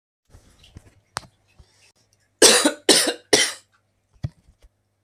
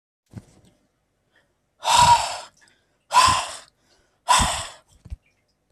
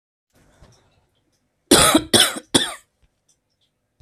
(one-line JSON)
{"three_cough_length": "5.0 s", "three_cough_amplitude": 32768, "three_cough_signal_mean_std_ratio": 0.29, "exhalation_length": "5.7 s", "exhalation_amplitude": 23369, "exhalation_signal_mean_std_ratio": 0.36, "cough_length": "4.0 s", "cough_amplitude": 32767, "cough_signal_mean_std_ratio": 0.31, "survey_phase": "alpha (2021-03-01 to 2021-08-12)", "age": "18-44", "gender": "Male", "wearing_mask": "No", "symptom_none": true, "smoker_status": "Never smoked", "respiratory_condition_asthma": false, "respiratory_condition_other": false, "recruitment_source": "REACT", "submission_delay": "2 days", "covid_test_result": "Negative", "covid_test_method": "RT-qPCR"}